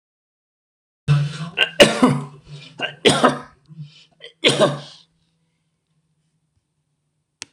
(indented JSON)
{
  "three_cough_length": "7.5 s",
  "three_cough_amplitude": 26028,
  "three_cough_signal_mean_std_ratio": 0.34,
  "survey_phase": "alpha (2021-03-01 to 2021-08-12)",
  "age": "65+",
  "gender": "Male",
  "wearing_mask": "No",
  "symptom_none": true,
  "smoker_status": "Ex-smoker",
  "respiratory_condition_asthma": false,
  "respiratory_condition_other": false,
  "recruitment_source": "REACT",
  "submission_delay": "3 days",
  "covid_test_result": "Negative",
  "covid_test_method": "RT-qPCR"
}